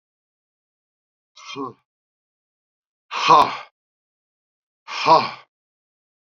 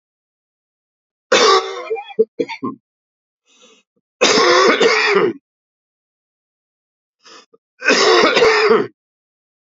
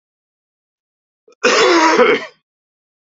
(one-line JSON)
{"exhalation_length": "6.4 s", "exhalation_amplitude": 29815, "exhalation_signal_mean_std_ratio": 0.25, "three_cough_length": "9.7 s", "three_cough_amplitude": 32768, "three_cough_signal_mean_std_ratio": 0.46, "cough_length": "3.1 s", "cough_amplitude": 32767, "cough_signal_mean_std_ratio": 0.43, "survey_phase": "beta (2021-08-13 to 2022-03-07)", "age": "65+", "gender": "Male", "wearing_mask": "No", "symptom_cough_any": true, "symptom_runny_or_blocked_nose": true, "symptom_headache": true, "symptom_onset": "3 days", "smoker_status": "Never smoked", "respiratory_condition_asthma": false, "respiratory_condition_other": false, "recruitment_source": "REACT", "submission_delay": "5 days", "covid_test_result": "Negative", "covid_test_method": "RT-qPCR", "influenza_a_test_result": "Negative", "influenza_b_test_result": "Negative"}